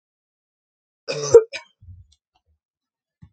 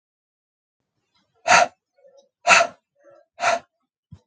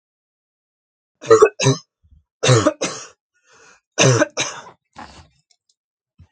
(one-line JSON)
{"cough_length": "3.3 s", "cough_amplitude": 32767, "cough_signal_mean_std_ratio": 0.18, "exhalation_length": "4.3 s", "exhalation_amplitude": 32767, "exhalation_signal_mean_std_ratio": 0.28, "three_cough_length": "6.3 s", "three_cough_amplitude": 32767, "three_cough_signal_mean_std_ratio": 0.33, "survey_phase": "beta (2021-08-13 to 2022-03-07)", "age": "18-44", "gender": "Female", "wearing_mask": "No", "symptom_sore_throat": true, "smoker_status": "Never smoked", "respiratory_condition_asthma": false, "respiratory_condition_other": false, "recruitment_source": "Test and Trace", "submission_delay": "1 day", "covid_test_result": "Positive", "covid_test_method": "RT-qPCR", "covid_ct_value": 25.2, "covid_ct_gene": "ORF1ab gene", "covid_ct_mean": 25.5, "covid_viral_load": "4300 copies/ml", "covid_viral_load_category": "Minimal viral load (< 10K copies/ml)"}